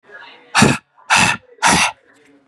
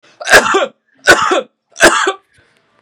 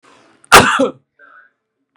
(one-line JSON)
{"exhalation_length": "2.5 s", "exhalation_amplitude": 32768, "exhalation_signal_mean_std_ratio": 0.48, "three_cough_length": "2.8 s", "three_cough_amplitude": 32768, "three_cough_signal_mean_std_ratio": 0.5, "cough_length": "2.0 s", "cough_amplitude": 32768, "cough_signal_mean_std_ratio": 0.33, "survey_phase": "beta (2021-08-13 to 2022-03-07)", "age": "18-44", "gender": "Male", "wearing_mask": "No", "symptom_none": true, "smoker_status": "Current smoker (e-cigarettes or vapes only)", "respiratory_condition_asthma": false, "respiratory_condition_other": false, "recruitment_source": "REACT", "submission_delay": "4 days", "covid_test_result": "Negative", "covid_test_method": "RT-qPCR", "influenza_a_test_result": "Negative", "influenza_b_test_result": "Negative"}